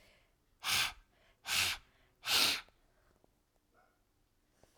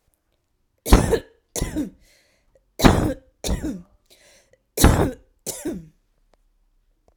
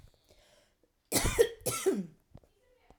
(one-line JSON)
{"exhalation_length": "4.8 s", "exhalation_amplitude": 5748, "exhalation_signal_mean_std_ratio": 0.36, "three_cough_length": "7.2 s", "three_cough_amplitude": 32768, "three_cough_signal_mean_std_ratio": 0.33, "cough_length": "3.0 s", "cough_amplitude": 9944, "cough_signal_mean_std_ratio": 0.38, "survey_phase": "alpha (2021-03-01 to 2021-08-12)", "age": "45-64", "gender": "Female", "wearing_mask": "No", "symptom_fatigue": true, "symptom_headache": true, "symptom_change_to_sense_of_smell_or_taste": true, "symptom_loss_of_taste": true, "smoker_status": "Ex-smoker", "respiratory_condition_asthma": false, "respiratory_condition_other": false, "recruitment_source": "REACT", "submission_delay": "2 days", "covid_test_result": "Negative", "covid_test_method": "RT-qPCR"}